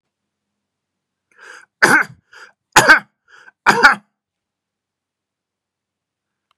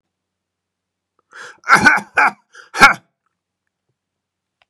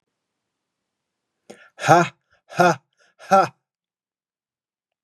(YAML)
three_cough_length: 6.6 s
three_cough_amplitude: 32768
three_cough_signal_mean_std_ratio: 0.25
cough_length: 4.7 s
cough_amplitude: 32768
cough_signal_mean_std_ratio: 0.28
exhalation_length: 5.0 s
exhalation_amplitude: 32760
exhalation_signal_mean_std_ratio: 0.26
survey_phase: beta (2021-08-13 to 2022-03-07)
age: 45-64
gender: Male
wearing_mask: 'No'
symptom_fatigue: true
smoker_status: Ex-smoker
respiratory_condition_asthma: false
respiratory_condition_other: false
recruitment_source: REACT
submission_delay: 1 day
covid_test_result: Negative
covid_test_method: RT-qPCR
influenza_a_test_result: Negative
influenza_b_test_result: Negative